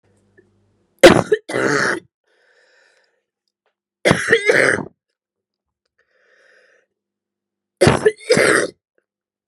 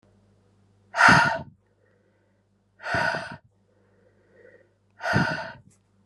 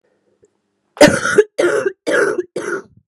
three_cough_length: 9.5 s
three_cough_amplitude: 32768
three_cough_signal_mean_std_ratio: 0.33
exhalation_length: 6.1 s
exhalation_amplitude: 24577
exhalation_signal_mean_std_ratio: 0.33
cough_length: 3.1 s
cough_amplitude: 32768
cough_signal_mean_std_ratio: 0.47
survey_phase: beta (2021-08-13 to 2022-03-07)
age: 18-44
gender: Female
wearing_mask: 'No'
symptom_cough_any: true
symptom_new_continuous_cough: true
symptom_shortness_of_breath: true
symptom_fever_high_temperature: true
symptom_headache: true
symptom_change_to_sense_of_smell_or_taste: true
symptom_onset: 2 days
smoker_status: Current smoker (e-cigarettes or vapes only)
respiratory_condition_asthma: false
respiratory_condition_other: false
recruitment_source: Test and Trace
submission_delay: 1 day
covid_test_result: Positive
covid_test_method: RT-qPCR
covid_ct_value: 11.8
covid_ct_gene: ORF1ab gene
covid_ct_mean: 12.2
covid_viral_load: 100000000 copies/ml
covid_viral_load_category: High viral load (>1M copies/ml)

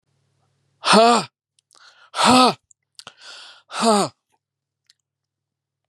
exhalation_length: 5.9 s
exhalation_amplitude: 31316
exhalation_signal_mean_std_ratio: 0.33
survey_phase: beta (2021-08-13 to 2022-03-07)
age: 45-64
gender: Male
wearing_mask: 'No'
symptom_shortness_of_breath: true
symptom_fatigue: true
smoker_status: Ex-smoker
respiratory_condition_asthma: false
respiratory_condition_other: false
recruitment_source: REACT
submission_delay: 11 days
covid_test_result: Negative
covid_test_method: RT-qPCR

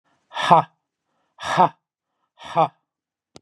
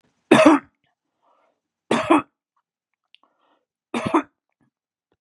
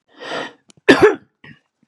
exhalation_length: 3.4 s
exhalation_amplitude: 31788
exhalation_signal_mean_std_ratio: 0.29
three_cough_length: 5.2 s
three_cough_amplitude: 32767
three_cough_signal_mean_std_ratio: 0.28
cough_length: 1.9 s
cough_amplitude: 32768
cough_signal_mean_std_ratio: 0.32
survey_phase: beta (2021-08-13 to 2022-03-07)
age: 45-64
gender: Male
wearing_mask: 'No'
symptom_none: true
smoker_status: Never smoked
respiratory_condition_asthma: true
respiratory_condition_other: false
recruitment_source: REACT
submission_delay: 3 days
covid_test_result: Negative
covid_test_method: RT-qPCR
influenza_a_test_result: Negative
influenza_b_test_result: Negative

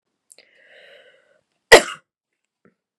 cough_length: 3.0 s
cough_amplitude: 32768
cough_signal_mean_std_ratio: 0.15
survey_phase: beta (2021-08-13 to 2022-03-07)
age: 18-44
gender: Female
wearing_mask: 'No'
symptom_cough_any: true
symptom_runny_or_blocked_nose: true
symptom_sore_throat: true
symptom_change_to_sense_of_smell_or_taste: true
symptom_loss_of_taste: true
symptom_onset: 2 days
smoker_status: Never smoked
respiratory_condition_asthma: false
respiratory_condition_other: false
recruitment_source: Test and Trace
submission_delay: 1 day
covid_test_result: Positive
covid_test_method: RT-qPCR
covid_ct_value: 18.1
covid_ct_gene: ORF1ab gene
covid_ct_mean: 18.3
covid_viral_load: 970000 copies/ml
covid_viral_load_category: Low viral load (10K-1M copies/ml)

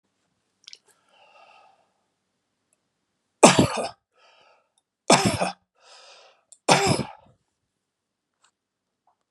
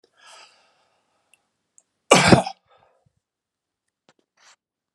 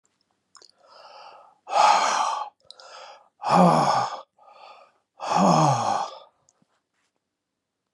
three_cough_length: 9.3 s
three_cough_amplitude: 32767
three_cough_signal_mean_std_ratio: 0.24
cough_length: 4.9 s
cough_amplitude: 32768
cough_signal_mean_std_ratio: 0.19
exhalation_length: 7.9 s
exhalation_amplitude: 18084
exhalation_signal_mean_std_ratio: 0.45
survey_phase: beta (2021-08-13 to 2022-03-07)
age: 65+
gender: Male
wearing_mask: 'No'
symptom_none: true
smoker_status: Never smoked
respiratory_condition_asthma: false
respiratory_condition_other: false
recruitment_source: REACT
submission_delay: 2 days
covid_test_result: Negative
covid_test_method: RT-qPCR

